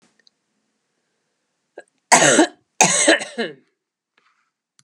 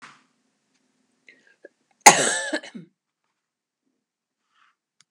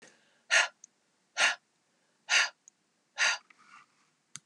{
  "three_cough_length": "4.8 s",
  "three_cough_amplitude": 32768,
  "three_cough_signal_mean_std_ratio": 0.32,
  "cough_length": "5.1 s",
  "cough_amplitude": 32768,
  "cough_signal_mean_std_ratio": 0.18,
  "exhalation_length": "4.5 s",
  "exhalation_amplitude": 9176,
  "exhalation_signal_mean_std_ratio": 0.32,
  "survey_phase": "beta (2021-08-13 to 2022-03-07)",
  "age": "45-64",
  "gender": "Female",
  "wearing_mask": "No",
  "symptom_none": true,
  "smoker_status": "Never smoked",
  "respiratory_condition_asthma": false,
  "respiratory_condition_other": false,
  "recruitment_source": "REACT",
  "submission_delay": "2 days",
  "covid_test_result": "Negative",
  "covid_test_method": "RT-qPCR",
  "influenza_a_test_result": "Unknown/Void",
  "influenza_b_test_result": "Unknown/Void"
}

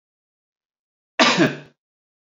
{
  "cough_length": "2.4 s",
  "cough_amplitude": 27818,
  "cough_signal_mean_std_ratio": 0.29,
  "survey_phase": "alpha (2021-03-01 to 2021-08-12)",
  "age": "18-44",
  "gender": "Male",
  "wearing_mask": "No",
  "symptom_new_continuous_cough": true,
  "symptom_fatigue": true,
  "symptom_fever_high_temperature": true,
  "smoker_status": "Never smoked",
  "respiratory_condition_asthma": false,
  "respiratory_condition_other": false,
  "recruitment_source": "Test and Trace",
  "submission_delay": "2 days",
  "covid_test_result": "Positive",
  "covid_test_method": "RT-qPCR",
  "covid_ct_value": 10.7,
  "covid_ct_gene": "ORF1ab gene",
  "covid_ct_mean": 11.0,
  "covid_viral_load": "250000000 copies/ml",
  "covid_viral_load_category": "High viral load (>1M copies/ml)"
}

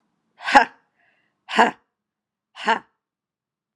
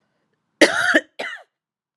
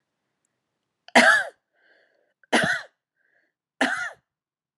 {
  "exhalation_length": "3.8 s",
  "exhalation_amplitude": 32767,
  "exhalation_signal_mean_std_ratio": 0.25,
  "cough_length": "2.0 s",
  "cough_amplitude": 32767,
  "cough_signal_mean_std_ratio": 0.34,
  "three_cough_length": "4.8 s",
  "three_cough_amplitude": 29355,
  "three_cough_signal_mean_std_ratio": 0.3,
  "survey_phase": "beta (2021-08-13 to 2022-03-07)",
  "age": "45-64",
  "gender": "Female",
  "wearing_mask": "No",
  "symptom_cough_any": true,
  "symptom_runny_or_blocked_nose": true,
  "symptom_fatigue": true,
  "symptom_headache": true,
  "symptom_onset": "3 days",
  "smoker_status": "Never smoked",
  "respiratory_condition_asthma": false,
  "respiratory_condition_other": true,
  "recruitment_source": "Test and Trace",
  "submission_delay": "1 day",
  "covid_test_result": "Positive",
  "covid_test_method": "RT-qPCR",
  "covid_ct_value": 23.9,
  "covid_ct_gene": "N gene"
}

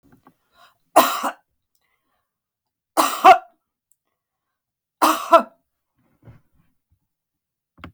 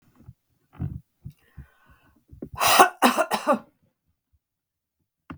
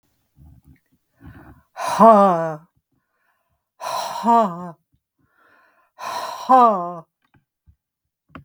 {
  "three_cough_length": "7.9 s",
  "three_cough_amplitude": 32768,
  "three_cough_signal_mean_std_ratio": 0.24,
  "cough_length": "5.4 s",
  "cough_amplitude": 32766,
  "cough_signal_mean_std_ratio": 0.3,
  "exhalation_length": "8.4 s",
  "exhalation_amplitude": 32768,
  "exhalation_signal_mean_std_ratio": 0.35,
  "survey_phase": "beta (2021-08-13 to 2022-03-07)",
  "age": "65+",
  "gender": "Female",
  "wearing_mask": "No",
  "symptom_none": true,
  "smoker_status": "Never smoked",
  "respiratory_condition_asthma": true,
  "respiratory_condition_other": false,
  "recruitment_source": "REACT",
  "submission_delay": "1 day",
  "covid_test_result": "Negative",
  "covid_test_method": "RT-qPCR",
  "influenza_a_test_result": "Unknown/Void",
  "influenza_b_test_result": "Unknown/Void"
}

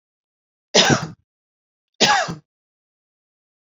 {
  "three_cough_length": "3.7 s",
  "three_cough_amplitude": 32767,
  "three_cough_signal_mean_std_ratio": 0.31,
  "survey_phase": "beta (2021-08-13 to 2022-03-07)",
  "age": "45-64",
  "gender": "Female",
  "wearing_mask": "No",
  "symptom_none": true,
  "smoker_status": "Never smoked",
  "respiratory_condition_asthma": false,
  "respiratory_condition_other": false,
  "recruitment_source": "REACT",
  "submission_delay": "1 day",
  "covid_test_result": "Negative",
  "covid_test_method": "RT-qPCR"
}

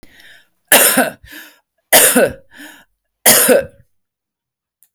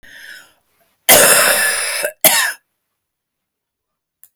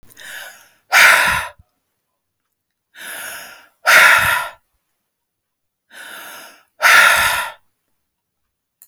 {
  "three_cough_length": "4.9 s",
  "three_cough_amplitude": 32768,
  "three_cough_signal_mean_std_ratio": 0.41,
  "cough_length": "4.4 s",
  "cough_amplitude": 32768,
  "cough_signal_mean_std_ratio": 0.43,
  "exhalation_length": "8.9 s",
  "exhalation_amplitude": 32768,
  "exhalation_signal_mean_std_ratio": 0.38,
  "survey_phase": "alpha (2021-03-01 to 2021-08-12)",
  "age": "45-64",
  "gender": "Female",
  "wearing_mask": "No",
  "symptom_diarrhoea": true,
  "symptom_fatigue": true,
  "symptom_onset": "12 days",
  "smoker_status": "Current smoker (11 or more cigarettes per day)",
  "respiratory_condition_asthma": false,
  "respiratory_condition_other": false,
  "recruitment_source": "REACT",
  "submission_delay": "1 day",
  "covid_test_result": "Negative",
  "covid_test_method": "RT-qPCR"
}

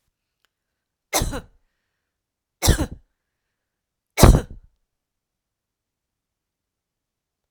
{
  "three_cough_length": "7.5 s",
  "three_cough_amplitude": 32768,
  "three_cough_signal_mean_std_ratio": 0.2,
  "survey_phase": "alpha (2021-03-01 to 2021-08-12)",
  "age": "45-64",
  "gender": "Female",
  "wearing_mask": "No",
  "symptom_none": true,
  "smoker_status": "Ex-smoker",
  "respiratory_condition_asthma": false,
  "respiratory_condition_other": false,
  "recruitment_source": "REACT",
  "submission_delay": "1 day",
  "covid_test_result": "Negative",
  "covid_test_method": "RT-qPCR"
}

